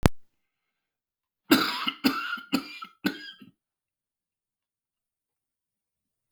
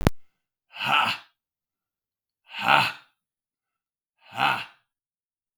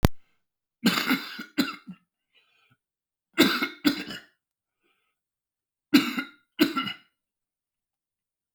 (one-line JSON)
{"cough_length": "6.3 s", "cough_amplitude": 32496, "cough_signal_mean_std_ratio": 0.28, "exhalation_length": "5.6 s", "exhalation_amplitude": 32635, "exhalation_signal_mean_std_ratio": 0.33, "three_cough_length": "8.5 s", "three_cough_amplitude": 32768, "three_cough_signal_mean_std_ratio": 0.32, "survey_phase": "beta (2021-08-13 to 2022-03-07)", "age": "65+", "gender": "Male", "wearing_mask": "No", "symptom_none": true, "smoker_status": "Never smoked", "respiratory_condition_asthma": false, "respiratory_condition_other": false, "recruitment_source": "REACT", "submission_delay": "1 day", "covid_test_result": "Negative", "covid_test_method": "RT-qPCR", "influenza_a_test_result": "Negative", "influenza_b_test_result": "Negative"}